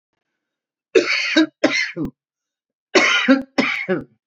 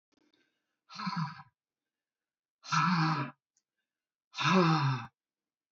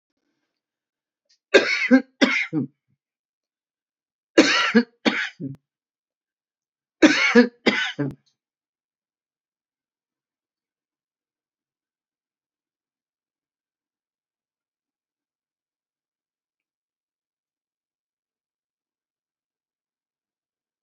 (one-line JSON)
{"cough_length": "4.3 s", "cough_amplitude": 29621, "cough_signal_mean_std_ratio": 0.49, "exhalation_length": "5.7 s", "exhalation_amplitude": 6235, "exhalation_signal_mean_std_ratio": 0.43, "three_cough_length": "20.8 s", "three_cough_amplitude": 32081, "three_cough_signal_mean_std_ratio": 0.22, "survey_phase": "beta (2021-08-13 to 2022-03-07)", "age": "65+", "gender": "Female", "wearing_mask": "No", "symptom_none": true, "smoker_status": "Never smoked", "respiratory_condition_asthma": false, "respiratory_condition_other": false, "recruitment_source": "REACT", "submission_delay": "1 day", "covid_test_result": "Negative", "covid_test_method": "RT-qPCR", "influenza_a_test_result": "Negative", "influenza_b_test_result": "Negative"}